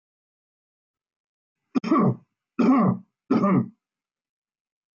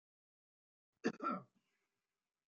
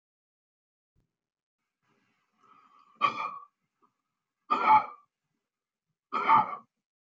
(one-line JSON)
{"three_cough_length": "4.9 s", "three_cough_amplitude": 11101, "three_cough_signal_mean_std_ratio": 0.4, "cough_length": "2.5 s", "cough_amplitude": 2001, "cough_signal_mean_std_ratio": 0.25, "exhalation_length": "7.1 s", "exhalation_amplitude": 10067, "exhalation_signal_mean_std_ratio": 0.27, "survey_phase": "beta (2021-08-13 to 2022-03-07)", "age": "45-64", "gender": "Male", "wearing_mask": "No", "symptom_none": true, "smoker_status": "Never smoked", "respiratory_condition_asthma": false, "respiratory_condition_other": false, "recruitment_source": "REACT", "submission_delay": "1 day", "covid_test_result": "Negative", "covid_test_method": "RT-qPCR"}